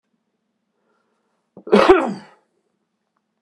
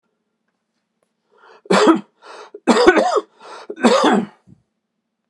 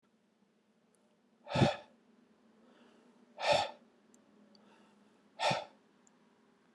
cough_length: 3.4 s
cough_amplitude: 32767
cough_signal_mean_std_ratio: 0.26
three_cough_length: 5.3 s
three_cough_amplitude: 32768
three_cough_signal_mean_std_ratio: 0.41
exhalation_length: 6.7 s
exhalation_amplitude: 6102
exhalation_signal_mean_std_ratio: 0.28
survey_phase: beta (2021-08-13 to 2022-03-07)
age: 45-64
gender: Male
wearing_mask: 'No'
symptom_cough_any: true
symptom_shortness_of_breath: true
symptom_fatigue: true
symptom_headache: true
smoker_status: Never smoked
respiratory_condition_asthma: false
respiratory_condition_other: false
recruitment_source: Test and Trace
submission_delay: 2 days
covid_test_result: Positive
covid_test_method: LFT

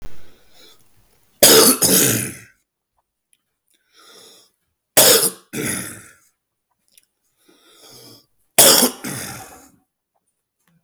three_cough_length: 10.8 s
three_cough_amplitude: 32768
three_cough_signal_mean_std_ratio: 0.35
survey_phase: beta (2021-08-13 to 2022-03-07)
age: 45-64
gender: Male
wearing_mask: 'No'
symptom_cough_any: true
symptom_other: true
smoker_status: Current smoker (11 or more cigarettes per day)
respiratory_condition_asthma: false
respiratory_condition_other: false
recruitment_source: REACT
submission_delay: 1 day
covid_test_result: Negative
covid_test_method: RT-qPCR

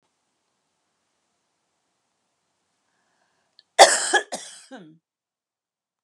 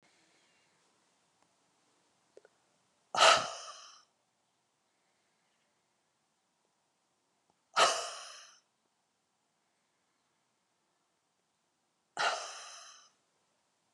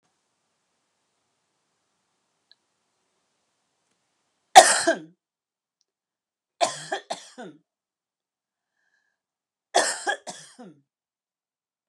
cough_length: 6.0 s
cough_amplitude: 32767
cough_signal_mean_std_ratio: 0.17
exhalation_length: 13.9 s
exhalation_amplitude: 11742
exhalation_signal_mean_std_ratio: 0.2
three_cough_length: 11.9 s
three_cough_amplitude: 32768
three_cough_signal_mean_std_ratio: 0.17
survey_phase: beta (2021-08-13 to 2022-03-07)
age: 45-64
gender: Female
wearing_mask: 'No'
symptom_none: true
smoker_status: Never smoked
respiratory_condition_asthma: false
respiratory_condition_other: false
recruitment_source: REACT
submission_delay: 2 days
covid_test_result: Negative
covid_test_method: RT-qPCR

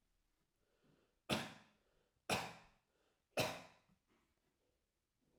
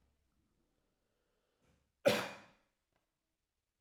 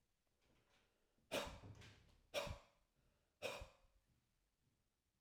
three_cough_length: 5.4 s
three_cough_amplitude: 2396
three_cough_signal_mean_std_ratio: 0.27
cough_length: 3.8 s
cough_amplitude: 4808
cough_signal_mean_std_ratio: 0.18
exhalation_length: 5.2 s
exhalation_amplitude: 988
exhalation_signal_mean_std_ratio: 0.34
survey_phase: alpha (2021-03-01 to 2021-08-12)
age: 45-64
gender: Male
wearing_mask: 'No'
symptom_none: true
smoker_status: Never smoked
respiratory_condition_asthma: true
respiratory_condition_other: false
recruitment_source: REACT
submission_delay: 1 day
covid_test_result: Negative
covid_test_method: RT-qPCR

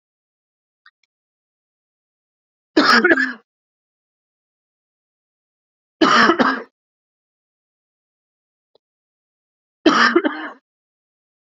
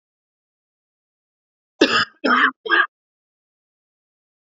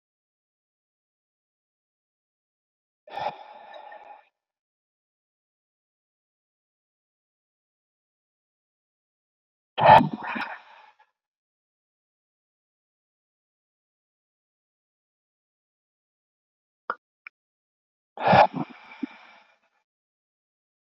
three_cough_length: 11.4 s
three_cough_amplitude: 32229
three_cough_signal_mean_std_ratio: 0.28
cough_length: 4.5 s
cough_amplitude: 27787
cough_signal_mean_std_ratio: 0.3
exhalation_length: 20.8 s
exhalation_amplitude: 26730
exhalation_signal_mean_std_ratio: 0.15
survey_phase: beta (2021-08-13 to 2022-03-07)
age: 45-64
gender: Male
wearing_mask: 'No'
symptom_cough_any: true
symptom_new_continuous_cough: true
symptom_runny_or_blocked_nose: true
symptom_shortness_of_breath: true
symptom_change_to_sense_of_smell_or_taste: true
symptom_onset: 5 days
smoker_status: Never smoked
respiratory_condition_asthma: true
respiratory_condition_other: false
recruitment_source: Test and Trace
submission_delay: 2 days
covid_test_result: Positive
covid_test_method: RT-qPCR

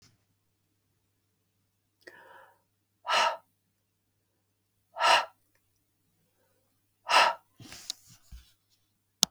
exhalation_length: 9.3 s
exhalation_amplitude: 32766
exhalation_signal_mean_std_ratio: 0.23
survey_phase: beta (2021-08-13 to 2022-03-07)
age: 45-64
gender: Female
wearing_mask: 'No'
symptom_none: true
smoker_status: Ex-smoker
respiratory_condition_asthma: false
respiratory_condition_other: false
recruitment_source: REACT
submission_delay: 2 days
covid_test_result: Negative
covid_test_method: RT-qPCR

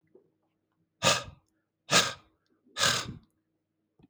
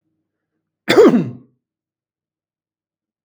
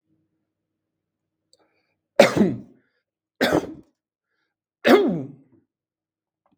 exhalation_length: 4.1 s
exhalation_amplitude: 14446
exhalation_signal_mean_std_ratio: 0.31
cough_length: 3.2 s
cough_amplitude: 32768
cough_signal_mean_std_ratio: 0.27
three_cough_length: 6.6 s
three_cough_amplitude: 32768
three_cough_signal_mean_std_ratio: 0.28
survey_phase: beta (2021-08-13 to 2022-03-07)
age: 45-64
gender: Male
wearing_mask: 'No'
symptom_none: true
smoker_status: Never smoked
respiratory_condition_asthma: false
respiratory_condition_other: false
recruitment_source: REACT
submission_delay: 3 days
covid_test_result: Negative
covid_test_method: RT-qPCR
influenza_a_test_result: Negative
influenza_b_test_result: Negative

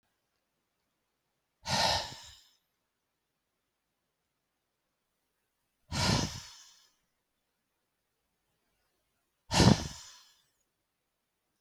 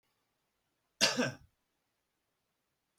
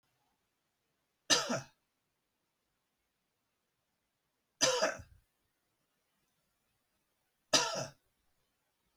exhalation_length: 11.6 s
exhalation_amplitude: 14798
exhalation_signal_mean_std_ratio: 0.23
cough_length: 3.0 s
cough_amplitude: 6406
cough_signal_mean_std_ratio: 0.24
three_cough_length: 9.0 s
three_cough_amplitude: 8129
three_cough_signal_mean_std_ratio: 0.24
survey_phase: beta (2021-08-13 to 2022-03-07)
age: 45-64
gender: Male
wearing_mask: 'No'
symptom_none: true
smoker_status: Never smoked
respiratory_condition_asthma: false
respiratory_condition_other: false
recruitment_source: REACT
submission_delay: 1 day
covid_test_result: Negative
covid_test_method: RT-qPCR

